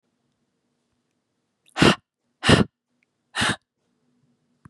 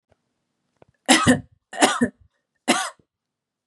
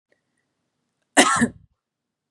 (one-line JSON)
{"exhalation_length": "4.7 s", "exhalation_amplitude": 28796, "exhalation_signal_mean_std_ratio": 0.24, "three_cough_length": "3.7 s", "three_cough_amplitude": 32666, "three_cough_signal_mean_std_ratio": 0.33, "cough_length": "2.3 s", "cough_amplitude": 32558, "cough_signal_mean_std_ratio": 0.27, "survey_phase": "beta (2021-08-13 to 2022-03-07)", "age": "18-44", "gender": "Female", "wearing_mask": "No", "symptom_none": true, "smoker_status": "Never smoked", "respiratory_condition_asthma": false, "respiratory_condition_other": false, "recruitment_source": "REACT", "submission_delay": "2 days", "covid_test_result": "Negative", "covid_test_method": "RT-qPCR", "influenza_a_test_result": "Negative", "influenza_b_test_result": "Negative"}